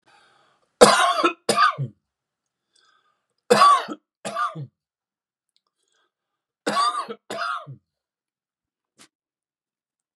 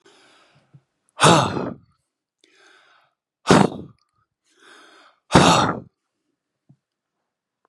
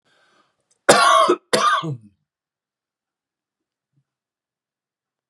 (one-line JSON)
{"three_cough_length": "10.2 s", "three_cough_amplitude": 32767, "three_cough_signal_mean_std_ratio": 0.32, "exhalation_length": "7.7 s", "exhalation_amplitude": 32768, "exhalation_signal_mean_std_ratio": 0.28, "cough_length": "5.3 s", "cough_amplitude": 32768, "cough_signal_mean_std_ratio": 0.31, "survey_phase": "beta (2021-08-13 to 2022-03-07)", "age": "65+", "gender": "Male", "wearing_mask": "No", "symptom_none": true, "smoker_status": "Ex-smoker", "respiratory_condition_asthma": false, "respiratory_condition_other": false, "recruitment_source": "REACT", "submission_delay": "2 days", "covid_test_result": "Negative", "covid_test_method": "RT-qPCR", "influenza_a_test_result": "Negative", "influenza_b_test_result": "Negative"}